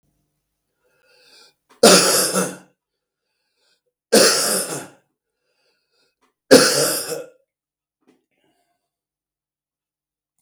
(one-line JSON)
{"three_cough_length": "10.4 s", "three_cough_amplitude": 32768, "three_cough_signal_mean_std_ratio": 0.31, "survey_phase": "beta (2021-08-13 to 2022-03-07)", "age": "65+", "gender": "Male", "wearing_mask": "No", "symptom_cough_any": true, "symptom_runny_or_blocked_nose": true, "symptom_sore_throat": true, "smoker_status": "Ex-smoker", "respiratory_condition_asthma": false, "respiratory_condition_other": false, "recruitment_source": "Test and Trace", "submission_delay": "2 days", "covid_test_result": "Positive", "covid_test_method": "RT-qPCR"}